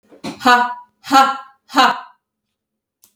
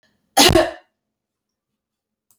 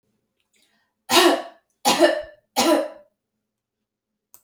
{"exhalation_length": "3.2 s", "exhalation_amplitude": 30289, "exhalation_signal_mean_std_ratio": 0.4, "cough_length": "2.4 s", "cough_amplitude": 32604, "cough_signal_mean_std_ratio": 0.28, "three_cough_length": "4.4 s", "three_cough_amplitude": 26115, "three_cough_signal_mean_std_ratio": 0.37, "survey_phase": "beta (2021-08-13 to 2022-03-07)", "age": "45-64", "gender": "Female", "wearing_mask": "No", "symptom_change_to_sense_of_smell_or_taste": true, "smoker_status": "Never smoked", "respiratory_condition_asthma": false, "respiratory_condition_other": false, "recruitment_source": "REACT", "submission_delay": "12 days", "covid_test_result": "Negative", "covid_test_method": "RT-qPCR"}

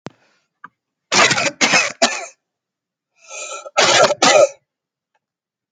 {"cough_length": "5.7 s", "cough_amplitude": 32768, "cough_signal_mean_std_ratio": 0.42, "survey_phase": "alpha (2021-03-01 to 2021-08-12)", "age": "18-44", "gender": "Male", "wearing_mask": "No", "symptom_none": true, "smoker_status": "Never smoked", "respiratory_condition_asthma": false, "respiratory_condition_other": false, "recruitment_source": "REACT", "submission_delay": "2 days", "covid_test_result": "Negative", "covid_test_method": "RT-qPCR"}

